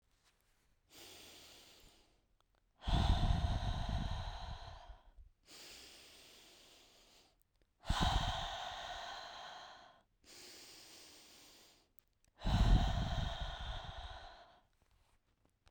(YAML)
exhalation_length: 15.7 s
exhalation_amplitude: 3817
exhalation_signal_mean_std_ratio: 0.44
survey_phase: beta (2021-08-13 to 2022-03-07)
age: 18-44
gender: Female
wearing_mask: 'No'
symptom_cough_any: true
symptom_runny_or_blocked_nose: true
symptom_shortness_of_breath: true
symptom_sore_throat: true
symptom_fatigue: true
symptom_onset: 3 days
smoker_status: Ex-smoker
respiratory_condition_asthma: false
respiratory_condition_other: false
recruitment_source: Test and Trace
submission_delay: 1 day
covid_test_result: Positive
covid_test_method: RT-qPCR
covid_ct_value: 19.8
covid_ct_gene: ORF1ab gene
covid_ct_mean: 20.1
covid_viral_load: 250000 copies/ml
covid_viral_load_category: Low viral load (10K-1M copies/ml)